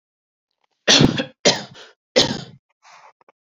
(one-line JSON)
{"three_cough_length": "3.4 s", "three_cough_amplitude": 32767, "three_cough_signal_mean_std_ratio": 0.34, "survey_phase": "alpha (2021-03-01 to 2021-08-12)", "age": "18-44", "gender": "Female", "wearing_mask": "No", "symptom_cough_any": true, "symptom_fatigue": true, "symptom_headache": true, "smoker_status": "Never smoked", "respiratory_condition_asthma": false, "respiratory_condition_other": false, "recruitment_source": "Test and Trace", "submission_delay": "2 days", "covid_test_result": "Positive", "covid_test_method": "RT-qPCR", "covid_ct_value": 22.9, "covid_ct_gene": "ORF1ab gene"}